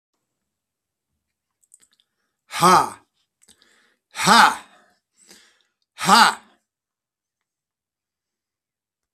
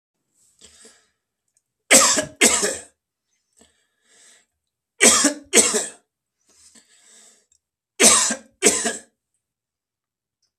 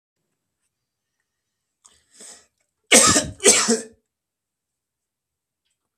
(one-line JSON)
{"exhalation_length": "9.1 s", "exhalation_amplitude": 31835, "exhalation_signal_mean_std_ratio": 0.24, "three_cough_length": "10.6 s", "three_cough_amplitude": 32768, "three_cough_signal_mean_std_ratio": 0.32, "cough_length": "6.0 s", "cough_amplitude": 32768, "cough_signal_mean_std_ratio": 0.26, "survey_phase": "beta (2021-08-13 to 2022-03-07)", "age": "65+", "gender": "Male", "wearing_mask": "No", "symptom_cough_any": true, "symptom_runny_or_blocked_nose": true, "symptom_fatigue": true, "symptom_onset": "12 days", "smoker_status": "Ex-smoker", "respiratory_condition_asthma": false, "respiratory_condition_other": true, "recruitment_source": "REACT", "submission_delay": "2 days", "covid_test_result": "Negative", "covid_test_method": "RT-qPCR", "influenza_a_test_result": "Negative", "influenza_b_test_result": "Negative"}